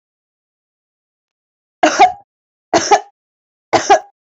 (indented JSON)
{
  "three_cough_length": "4.4 s",
  "three_cough_amplitude": 29453,
  "three_cough_signal_mean_std_ratio": 0.31,
  "survey_phase": "alpha (2021-03-01 to 2021-08-12)",
  "age": "18-44",
  "gender": "Female",
  "wearing_mask": "No",
  "symptom_none": true,
  "smoker_status": "Current smoker (e-cigarettes or vapes only)",
  "respiratory_condition_asthma": false,
  "respiratory_condition_other": false,
  "recruitment_source": "REACT",
  "submission_delay": "1 day",
  "covid_test_result": "Negative",
  "covid_test_method": "RT-qPCR"
}